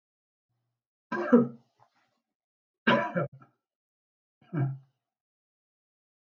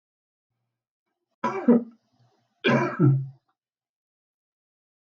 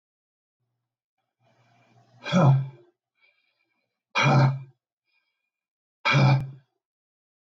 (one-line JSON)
{"three_cough_length": "6.3 s", "three_cough_amplitude": 12205, "three_cough_signal_mean_std_ratio": 0.27, "cough_length": "5.1 s", "cough_amplitude": 13388, "cough_signal_mean_std_ratio": 0.32, "exhalation_length": "7.4 s", "exhalation_amplitude": 13221, "exhalation_signal_mean_std_ratio": 0.34, "survey_phase": "beta (2021-08-13 to 2022-03-07)", "age": "65+", "gender": "Male", "wearing_mask": "No", "symptom_none": true, "smoker_status": "Never smoked", "respiratory_condition_asthma": false, "respiratory_condition_other": false, "recruitment_source": "REACT", "submission_delay": "0 days", "covid_test_result": "Negative", "covid_test_method": "RT-qPCR"}